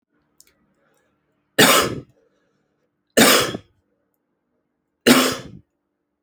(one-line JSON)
{"three_cough_length": "6.2 s", "three_cough_amplitude": 32485, "three_cough_signal_mean_std_ratio": 0.31, "survey_phase": "alpha (2021-03-01 to 2021-08-12)", "age": "18-44", "gender": "Male", "wearing_mask": "No", "symptom_cough_any": true, "smoker_status": "Ex-smoker", "respiratory_condition_asthma": false, "respiratory_condition_other": false, "recruitment_source": "Test and Trace", "submission_delay": "7 days", "covid_test_result": "Positive", "covid_test_method": "RT-qPCR", "covid_ct_value": 37.3, "covid_ct_gene": "N gene"}